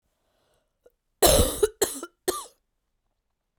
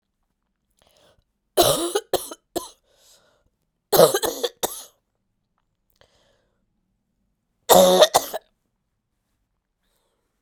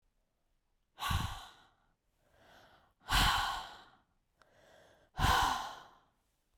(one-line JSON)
{"cough_length": "3.6 s", "cough_amplitude": 23391, "cough_signal_mean_std_ratio": 0.31, "three_cough_length": "10.4 s", "three_cough_amplitude": 32768, "three_cough_signal_mean_std_ratio": 0.27, "exhalation_length": "6.6 s", "exhalation_amplitude": 5500, "exhalation_signal_mean_std_ratio": 0.38, "survey_phase": "beta (2021-08-13 to 2022-03-07)", "age": "45-64", "gender": "Female", "wearing_mask": "No", "symptom_cough_any": true, "symptom_new_continuous_cough": true, "symptom_runny_or_blocked_nose": true, "symptom_sore_throat": true, "symptom_abdominal_pain": true, "symptom_fatigue": true, "symptom_fever_high_temperature": true, "symptom_headache": true, "symptom_change_to_sense_of_smell_or_taste": true, "symptom_onset": "4 days", "smoker_status": "Never smoked", "respiratory_condition_asthma": false, "respiratory_condition_other": false, "recruitment_source": "Test and Trace", "submission_delay": "1 day", "covid_test_result": "Positive", "covid_test_method": "RT-qPCR", "covid_ct_value": 20.4, "covid_ct_gene": "ORF1ab gene", "covid_ct_mean": 21.2, "covid_viral_load": "120000 copies/ml", "covid_viral_load_category": "Low viral load (10K-1M copies/ml)"}